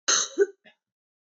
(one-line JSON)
{"cough_length": "1.4 s", "cough_amplitude": 11745, "cough_signal_mean_std_ratio": 0.36, "survey_phase": "beta (2021-08-13 to 2022-03-07)", "age": "18-44", "gender": "Female", "wearing_mask": "No", "symptom_cough_any": true, "symptom_runny_or_blocked_nose": true, "symptom_sore_throat": true, "symptom_onset": "3 days", "smoker_status": "Never smoked", "respiratory_condition_asthma": false, "respiratory_condition_other": false, "recruitment_source": "Test and Trace", "submission_delay": "1 day", "covid_test_result": "Positive", "covid_test_method": "RT-qPCR", "covid_ct_value": 21.2, "covid_ct_gene": "ORF1ab gene", "covid_ct_mean": 21.4, "covid_viral_load": "92000 copies/ml", "covid_viral_load_category": "Low viral load (10K-1M copies/ml)"}